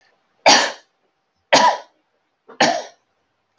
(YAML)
cough_length: 3.6 s
cough_amplitude: 32767
cough_signal_mean_std_ratio: 0.34
survey_phase: alpha (2021-03-01 to 2021-08-12)
age: 45-64
gender: Female
wearing_mask: 'No'
symptom_none: true
smoker_status: Current smoker (1 to 10 cigarettes per day)
respiratory_condition_asthma: false
respiratory_condition_other: false
recruitment_source: REACT
submission_delay: 3 days
covid_test_result: Negative
covid_test_method: RT-qPCR